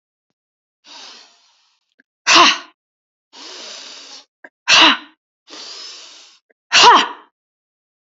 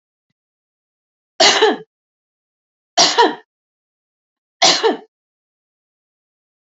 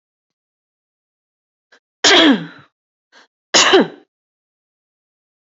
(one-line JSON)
{"exhalation_length": "8.1 s", "exhalation_amplitude": 32768, "exhalation_signal_mean_std_ratio": 0.31, "three_cough_length": "6.7 s", "three_cough_amplitude": 32118, "three_cough_signal_mean_std_ratio": 0.31, "cough_length": "5.5 s", "cough_amplitude": 31361, "cough_signal_mean_std_ratio": 0.29, "survey_phase": "alpha (2021-03-01 to 2021-08-12)", "age": "18-44", "gender": "Female", "wearing_mask": "No", "symptom_none": true, "smoker_status": "Never smoked", "respiratory_condition_asthma": false, "respiratory_condition_other": false, "recruitment_source": "REACT", "submission_delay": "1 day", "covid_test_result": "Negative", "covid_test_method": "RT-qPCR"}